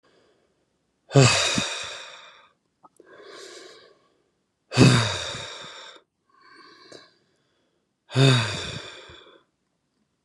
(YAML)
exhalation_length: 10.2 s
exhalation_amplitude: 25832
exhalation_signal_mean_std_ratio: 0.33
survey_phase: beta (2021-08-13 to 2022-03-07)
age: 18-44
gender: Male
wearing_mask: 'No'
symptom_none: true
smoker_status: Never smoked
respiratory_condition_asthma: false
respiratory_condition_other: false
recruitment_source: REACT
submission_delay: 0 days
covid_test_result: Negative
covid_test_method: RT-qPCR
influenza_a_test_result: Negative
influenza_b_test_result: Negative